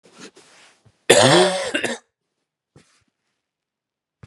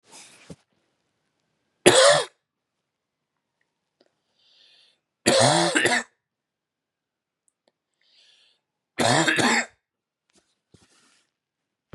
{"cough_length": "4.3 s", "cough_amplitude": 32768, "cough_signal_mean_std_ratio": 0.31, "three_cough_length": "11.9 s", "three_cough_amplitude": 32768, "three_cough_signal_mean_std_ratio": 0.3, "survey_phase": "beta (2021-08-13 to 2022-03-07)", "age": "18-44", "gender": "Male", "wearing_mask": "No", "symptom_cough_any": true, "symptom_shortness_of_breath": true, "symptom_fatigue": true, "symptom_other": true, "smoker_status": "Never smoked", "respiratory_condition_asthma": false, "respiratory_condition_other": false, "recruitment_source": "REACT", "submission_delay": "1 day", "covid_test_result": "Negative", "covid_test_method": "RT-qPCR", "influenza_a_test_result": "Unknown/Void", "influenza_b_test_result": "Unknown/Void"}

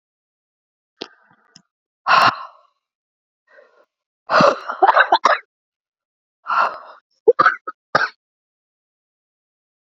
{"exhalation_length": "9.9 s", "exhalation_amplitude": 30621, "exhalation_signal_mean_std_ratio": 0.3, "survey_phase": "beta (2021-08-13 to 2022-03-07)", "age": "45-64", "gender": "Female", "wearing_mask": "No", "symptom_cough_any": true, "symptom_new_continuous_cough": true, "symptom_runny_or_blocked_nose": true, "symptom_shortness_of_breath": true, "symptom_sore_throat": true, "symptom_abdominal_pain": true, "symptom_diarrhoea": true, "symptom_fatigue": true, "symptom_fever_high_temperature": true, "symptom_headache": true, "symptom_change_to_sense_of_smell_or_taste": true, "symptom_loss_of_taste": true, "symptom_onset": "5 days", "smoker_status": "Ex-smoker", "respiratory_condition_asthma": true, "respiratory_condition_other": false, "recruitment_source": "Test and Trace", "submission_delay": "2 days", "covid_test_result": "Positive", "covid_test_method": "RT-qPCR", "covid_ct_value": 18.7, "covid_ct_gene": "ORF1ab gene", "covid_ct_mean": 19.7, "covid_viral_load": "350000 copies/ml", "covid_viral_load_category": "Low viral load (10K-1M copies/ml)"}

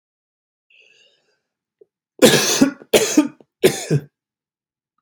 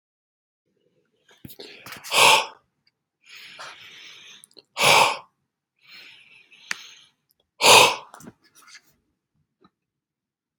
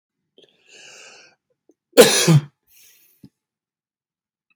{"three_cough_length": "5.0 s", "three_cough_amplitude": 32768, "three_cough_signal_mean_std_ratio": 0.34, "exhalation_length": "10.6 s", "exhalation_amplitude": 32768, "exhalation_signal_mean_std_ratio": 0.26, "cough_length": "4.6 s", "cough_amplitude": 32768, "cough_signal_mean_std_ratio": 0.24, "survey_phase": "beta (2021-08-13 to 2022-03-07)", "age": "18-44", "gender": "Male", "wearing_mask": "No", "symptom_none": true, "smoker_status": "Never smoked", "respiratory_condition_asthma": false, "respiratory_condition_other": false, "recruitment_source": "REACT", "submission_delay": "2 days", "covid_test_result": "Negative", "covid_test_method": "RT-qPCR", "influenza_a_test_result": "Negative", "influenza_b_test_result": "Negative"}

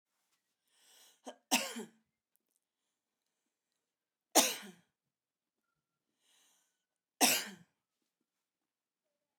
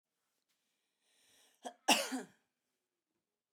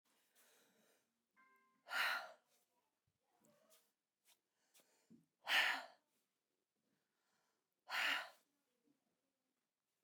{"three_cough_length": "9.4 s", "three_cough_amplitude": 8801, "three_cough_signal_mean_std_ratio": 0.2, "cough_length": "3.5 s", "cough_amplitude": 6199, "cough_signal_mean_std_ratio": 0.21, "exhalation_length": "10.0 s", "exhalation_amplitude": 2314, "exhalation_signal_mean_std_ratio": 0.26, "survey_phase": "beta (2021-08-13 to 2022-03-07)", "age": "18-44", "gender": "Female", "wearing_mask": "No", "symptom_none": true, "smoker_status": "Never smoked", "respiratory_condition_asthma": true, "respiratory_condition_other": false, "recruitment_source": "REACT", "submission_delay": "3 days", "covid_test_result": "Negative", "covid_test_method": "RT-qPCR"}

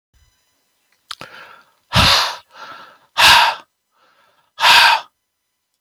{"exhalation_length": "5.8 s", "exhalation_amplitude": 32768, "exhalation_signal_mean_std_ratio": 0.37, "survey_phase": "beta (2021-08-13 to 2022-03-07)", "age": "65+", "gender": "Male", "wearing_mask": "No", "symptom_none": true, "smoker_status": "Never smoked", "respiratory_condition_asthma": false, "respiratory_condition_other": false, "recruitment_source": "REACT", "submission_delay": "3 days", "covid_test_result": "Negative", "covid_test_method": "RT-qPCR", "influenza_a_test_result": "Negative", "influenza_b_test_result": "Negative"}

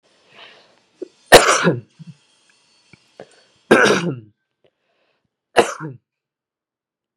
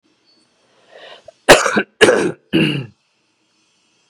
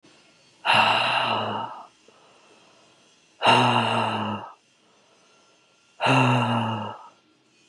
{"three_cough_length": "7.2 s", "three_cough_amplitude": 32768, "three_cough_signal_mean_std_ratio": 0.27, "cough_length": "4.1 s", "cough_amplitude": 32768, "cough_signal_mean_std_ratio": 0.35, "exhalation_length": "7.7 s", "exhalation_amplitude": 18837, "exhalation_signal_mean_std_ratio": 0.52, "survey_phase": "beta (2021-08-13 to 2022-03-07)", "age": "18-44", "gender": "Male", "wearing_mask": "Yes", "symptom_cough_any": true, "symptom_new_continuous_cough": true, "symptom_shortness_of_breath": true, "symptom_headache": true, "symptom_onset": "11 days", "smoker_status": "Never smoked", "respiratory_condition_asthma": false, "respiratory_condition_other": false, "recruitment_source": "Test and Trace", "submission_delay": "2 days", "covid_test_result": "Negative", "covid_test_method": "RT-qPCR"}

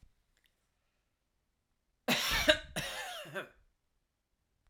{"cough_length": "4.7 s", "cough_amplitude": 9010, "cough_signal_mean_std_ratio": 0.32, "survey_phase": "alpha (2021-03-01 to 2021-08-12)", "age": "18-44", "gender": "Male", "wearing_mask": "No", "symptom_none": true, "smoker_status": "Never smoked", "respiratory_condition_asthma": false, "respiratory_condition_other": false, "recruitment_source": "REACT", "submission_delay": "1 day", "covid_test_result": "Negative", "covid_test_method": "RT-qPCR"}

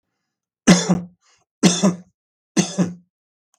{"three_cough_length": "3.6 s", "three_cough_amplitude": 32768, "three_cough_signal_mean_std_ratio": 0.37, "survey_phase": "beta (2021-08-13 to 2022-03-07)", "age": "65+", "gender": "Male", "wearing_mask": "No", "symptom_none": true, "smoker_status": "Ex-smoker", "respiratory_condition_asthma": false, "respiratory_condition_other": false, "recruitment_source": "REACT", "submission_delay": "3 days", "covid_test_result": "Negative", "covid_test_method": "RT-qPCR", "influenza_a_test_result": "Negative", "influenza_b_test_result": "Negative"}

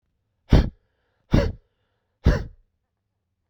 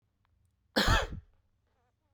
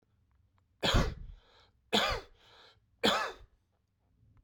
{"exhalation_length": "3.5 s", "exhalation_amplitude": 25746, "exhalation_signal_mean_std_ratio": 0.28, "cough_length": "2.1 s", "cough_amplitude": 7666, "cough_signal_mean_std_ratio": 0.32, "three_cough_length": "4.4 s", "three_cough_amplitude": 6996, "three_cough_signal_mean_std_ratio": 0.36, "survey_phase": "beta (2021-08-13 to 2022-03-07)", "age": "45-64", "gender": "Male", "wearing_mask": "No", "symptom_none": true, "smoker_status": "Ex-smoker", "respiratory_condition_asthma": false, "respiratory_condition_other": false, "recruitment_source": "REACT", "submission_delay": "1 day", "covid_test_result": "Negative", "covid_test_method": "RT-qPCR"}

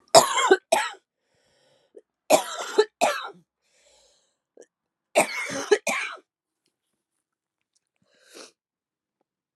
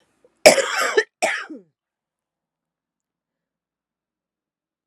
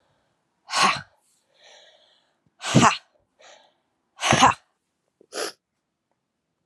{"three_cough_length": "9.6 s", "three_cough_amplitude": 32270, "three_cough_signal_mean_std_ratio": 0.29, "cough_length": "4.9 s", "cough_amplitude": 32768, "cough_signal_mean_std_ratio": 0.24, "exhalation_length": "6.7 s", "exhalation_amplitude": 29093, "exhalation_signal_mean_std_ratio": 0.28, "survey_phase": "alpha (2021-03-01 to 2021-08-12)", "age": "45-64", "gender": "Female", "wearing_mask": "No", "symptom_diarrhoea": true, "symptom_fatigue": true, "symptom_change_to_sense_of_smell_or_taste": true, "symptom_loss_of_taste": true, "smoker_status": "Ex-smoker", "respiratory_condition_asthma": false, "respiratory_condition_other": false, "recruitment_source": "Test and Trace", "submission_delay": "2 days", "covid_test_result": "Positive", "covid_test_method": "RT-qPCR", "covid_ct_value": 16.5, "covid_ct_gene": "ORF1ab gene", "covid_ct_mean": 17.2, "covid_viral_load": "2300000 copies/ml", "covid_viral_load_category": "High viral load (>1M copies/ml)"}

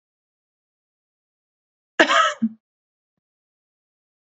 {"cough_length": "4.4 s", "cough_amplitude": 28903, "cough_signal_mean_std_ratio": 0.22, "survey_phase": "beta (2021-08-13 to 2022-03-07)", "age": "18-44", "gender": "Female", "wearing_mask": "No", "symptom_new_continuous_cough": true, "symptom_runny_or_blocked_nose": true, "symptom_fatigue": true, "symptom_headache": true, "symptom_onset": "3 days", "smoker_status": "Never smoked", "respiratory_condition_asthma": false, "respiratory_condition_other": false, "recruitment_source": "Test and Trace", "submission_delay": "2 days", "covid_test_result": "Positive", "covid_test_method": "RT-qPCR", "covid_ct_value": 27.0, "covid_ct_gene": "N gene"}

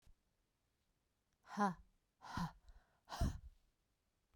{"exhalation_length": "4.4 s", "exhalation_amplitude": 1718, "exhalation_signal_mean_std_ratio": 0.32, "survey_phase": "beta (2021-08-13 to 2022-03-07)", "age": "45-64", "gender": "Female", "wearing_mask": "No", "symptom_sore_throat": true, "symptom_onset": "13 days", "smoker_status": "Never smoked", "respiratory_condition_asthma": false, "respiratory_condition_other": false, "recruitment_source": "REACT", "submission_delay": "2 days", "covid_test_result": "Negative", "covid_test_method": "RT-qPCR"}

